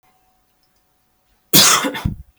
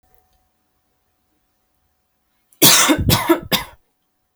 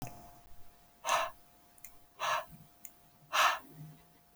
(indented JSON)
{
  "cough_length": "2.4 s",
  "cough_amplitude": 32768,
  "cough_signal_mean_std_ratio": 0.34,
  "three_cough_length": "4.4 s",
  "three_cough_amplitude": 32768,
  "three_cough_signal_mean_std_ratio": 0.33,
  "exhalation_length": "4.4 s",
  "exhalation_amplitude": 5771,
  "exhalation_signal_mean_std_ratio": 0.43,
  "survey_phase": "beta (2021-08-13 to 2022-03-07)",
  "age": "18-44",
  "gender": "Female",
  "wearing_mask": "No",
  "symptom_none": true,
  "smoker_status": "Never smoked",
  "respiratory_condition_asthma": false,
  "respiratory_condition_other": false,
  "recruitment_source": "REACT",
  "submission_delay": "1 day",
  "covid_test_result": "Negative",
  "covid_test_method": "RT-qPCR"
}